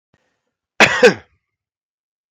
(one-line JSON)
{"cough_length": "2.3 s", "cough_amplitude": 32768, "cough_signal_mean_std_ratio": 0.27, "survey_phase": "beta (2021-08-13 to 2022-03-07)", "age": "18-44", "gender": "Male", "wearing_mask": "No", "symptom_cough_any": true, "symptom_runny_or_blocked_nose": true, "symptom_headache": true, "smoker_status": "Never smoked", "respiratory_condition_asthma": false, "respiratory_condition_other": false, "recruitment_source": "Test and Trace", "submission_delay": "3 days", "covid_test_result": "Positive", "covid_test_method": "RT-qPCR", "covid_ct_value": 17.4, "covid_ct_gene": "ORF1ab gene", "covid_ct_mean": 17.8, "covid_viral_load": "1400000 copies/ml", "covid_viral_load_category": "High viral load (>1M copies/ml)"}